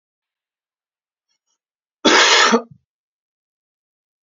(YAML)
cough_length: 4.4 s
cough_amplitude: 32768
cough_signal_mean_std_ratio: 0.29
survey_phase: beta (2021-08-13 to 2022-03-07)
age: 18-44
gender: Male
wearing_mask: 'No'
symptom_none: true
smoker_status: Ex-smoker
respiratory_condition_asthma: false
respiratory_condition_other: false
recruitment_source: REACT
submission_delay: 2 days
covid_test_result: Negative
covid_test_method: RT-qPCR